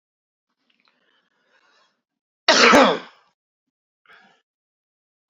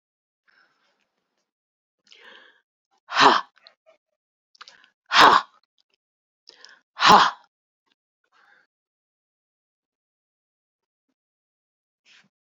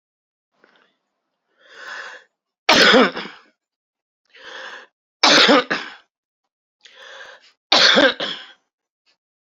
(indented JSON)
{
  "cough_length": "5.3 s",
  "cough_amplitude": 32454,
  "cough_signal_mean_std_ratio": 0.24,
  "exhalation_length": "12.5 s",
  "exhalation_amplitude": 28296,
  "exhalation_signal_mean_std_ratio": 0.2,
  "three_cough_length": "9.5 s",
  "three_cough_amplitude": 32767,
  "three_cough_signal_mean_std_ratio": 0.33,
  "survey_phase": "beta (2021-08-13 to 2022-03-07)",
  "age": "45-64",
  "gender": "Female",
  "wearing_mask": "No",
  "symptom_cough_any": true,
  "symptom_new_continuous_cough": true,
  "symptom_runny_or_blocked_nose": true,
  "symptom_shortness_of_breath": true,
  "symptom_sore_throat": true,
  "symptom_fever_high_temperature": true,
  "symptom_headache": true,
  "symptom_other": true,
  "symptom_onset": "12 days",
  "smoker_status": "Ex-smoker",
  "respiratory_condition_asthma": false,
  "respiratory_condition_other": false,
  "recruitment_source": "REACT",
  "submission_delay": "1 day",
  "covid_test_result": "Negative",
  "covid_test_method": "RT-qPCR"
}